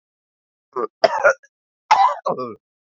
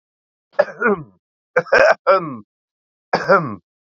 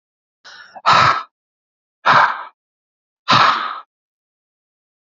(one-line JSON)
{"cough_length": "2.9 s", "cough_amplitude": 31126, "cough_signal_mean_std_ratio": 0.38, "three_cough_length": "3.9 s", "three_cough_amplitude": 32767, "three_cough_signal_mean_std_ratio": 0.4, "exhalation_length": "5.1 s", "exhalation_amplitude": 32768, "exhalation_signal_mean_std_ratio": 0.37, "survey_phase": "beta (2021-08-13 to 2022-03-07)", "age": "18-44", "gender": "Male", "wearing_mask": "No", "symptom_cough_any": true, "symptom_sore_throat": true, "symptom_fatigue": true, "symptom_fever_high_temperature": true, "symptom_headache": true, "symptom_change_to_sense_of_smell_or_taste": true, "symptom_other": true, "smoker_status": "Current smoker (11 or more cigarettes per day)", "respiratory_condition_asthma": false, "respiratory_condition_other": false, "recruitment_source": "Test and Trace", "submission_delay": "2 days", "covid_test_result": "Positive", "covid_test_method": "ePCR"}